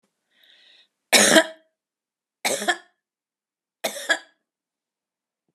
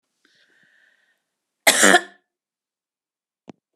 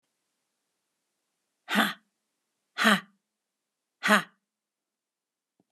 {"three_cough_length": "5.5 s", "three_cough_amplitude": 32601, "three_cough_signal_mean_std_ratio": 0.26, "cough_length": "3.8 s", "cough_amplitude": 32489, "cough_signal_mean_std_ratio": 0.22, "exhalation_length": "5.7 s", "exhalation_amplitude": 19840, "exhalation_signal_mean_std_ratio": 0.24, "survey_phase": "alpha (2021-03-01 to 2021-08-12)", "age": "45-64", "gender": "Female", "wearing_mask": "No", "symptom_none": true, "smoker_status": "Never smoked", "respiratory_condition_asthma": false, "respiratory_condition_other": false, "recruitment_source": "REACT", "submission_delay": "2 days", "covid_test_result": "Negative", "covid_test_method": "RT-qPCR"}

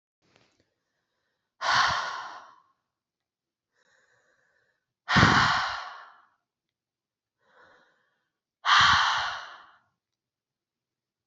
{"exhalation_length": "11.3 s", "exhalation_amplitude": 23085, "exhalation_signal_mean_std_ratio": 0.33, "survey_phase": "beta (2021-08-13 to 2022-03-07)", "age": "18-44", "gender": "Female", "wearing_mask": "No", "symptom_runny_or_blocked_nose": true, "symptom_headache": true, "smoker_status": "Never smoked", "respiratory_condition_asthma": false, "respiratory_condition_other": false, "recruitment_source": "Test and Trace", "submission_delay": "0 days", "covid_test_result": "Negative", "covid_test_method": "RT-qPCR"}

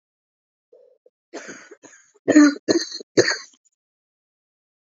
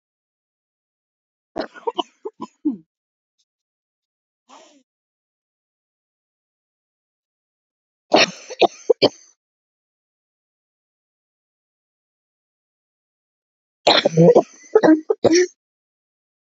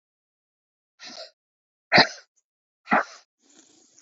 {"cough_length": "4.9 s", "cough_amplitude": 27941, "cough_signal_mean_std_ratio": 0.27, "three_cough_length": "16.6 s", "three_cough_amplitude": 31064, "three_cough_signal_mean_std_ratio": 0.23, "exhalation_length": "4.0 s", "exhalation_amplitude": 23458, "exhalation_signal_mean_std_ratio": 0.21, "survey_phase": "beta (2021-08-13 to 2022-03-07)", "age": "18-44", "gender": "Female", "wearing_mask": "No", "symptom_new_continuous_cough": true, "symptom_runny_or_blocked_nose": true, "symptom_shortness_of_breath": true, "symptom_sore_throat": true, "symptom_fatigue": true, "symptom_fever_high_temperature": true, "symptom_headache": true, "symptom_change_to_sense_of_smell_or_taste": true, "symptom_loss_of_taste": true, "symptom_onset": "3 days", "smoker_status": "Current smoker (e-cigarettes or vapes only)", "respiratory_condition_asthma": true, "respiratory_condition_other": false, "recruitment_source": "Test and Trace", "submission_delay": "2 days", "covid_test_result": "Positive", "covid_test_method": "RT-qPCR", "covid_ct_value": 27.8, "covid_ct_gene": "ORF1ab gene"}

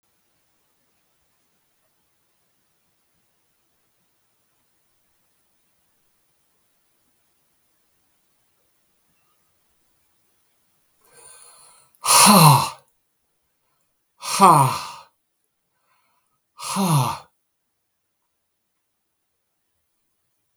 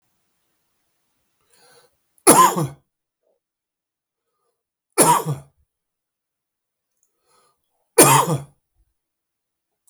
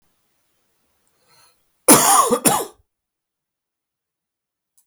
{"exhalation_length": "20.6 s", "exhalation_amplitude": 32766, "exhalation_signal_mean_std_ratio": 0.21, "three_cough_length": "9.9 s", "three_cough_amplitude": 32768, "three_cough_signal_mean_std_ratio": 0.25, "cough_length": "4.9 s", "cough_amplitude": 32768, "cough_signal_mean_std_ratio": 0.29, "survey_phase": "beta (2021-08-13 to 2022-03-07)", "age": "45-64", "gender": "Male", "wearing_mask": "No", "symptom_cough_any": true, "symptom_runny_or_blocked_nose": true, "symptom_fatigue": true, "symptom_fever_high_temperature": true, "symptom_headache": true, "symptom_onset": "5 days", "smoker_status": "Never smoked", "respiratory_condition_asthma": false, "respiratory_condition_other": false, "recruitment_source": "Test and Trace", "submission_delay": "2 days", "covid_test_result": "Positive", "covid_test_method": "RT-qPCR", "covid_ct_value": 16.2, "covid_ct_gene": "ORF1ab gene"}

